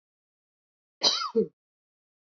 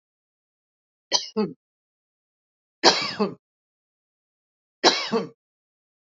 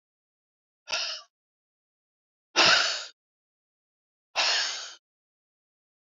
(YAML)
cough_length: 2.4 s
cough_amplitude: 12162
cough_signal_mean_std_ratio: 0.29
three_cough_length: 6.1 s
three_cough_amplitude: 30063
three_cough_signal_mean_std_ratio: 0.28
exhalation_length: 6.1 s
exhalation_amplitude: 15952
exhalation_signal_mean_std_ratio: 0.32
survey_phase: beta (2021-08-13 to 2022-03-07)
age: 45-64
gender: Female
wearing_mask: 'No'
symptom_fatigue: true
symptom_onset: 8 days
smoker_status: Ex-smoker
respiratory_condition_asthma: true
respiratory_condition_other: false
recruitment_source: REACT
submission_delay: 2 days
covid_test_result: Negative
covid_test_method: RT-qPCR
influenza_a_test_result: Negative
influenza_b_test_result: Negative